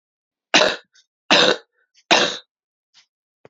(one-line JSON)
{"three_cough_length": "3.5 s", "three_cough_amplitude": 32555, "three_cough_signal_mean_std_ratio": 0.34, "survey_phase": "beta (2021-08-13 to 2022-03-07)", "age": "45-64", "gender": "Female", "wearing_mask": "No", "symptom_runny_or_blocked_nose": true, "symptom_onset": "3 days", "smoker_status": "Ex-smoker", "respiratory_condition_asthma": false, "respiratory_condition_other": false, "recruitment_source": "Test and Trace", "submission_delay": "2 days", "covid_test_result": "Positive", "covid_test_method": "RT-qPCR", "covid_ct_value": 23.3, "covid_ct_gene": "ORF1ab gene"}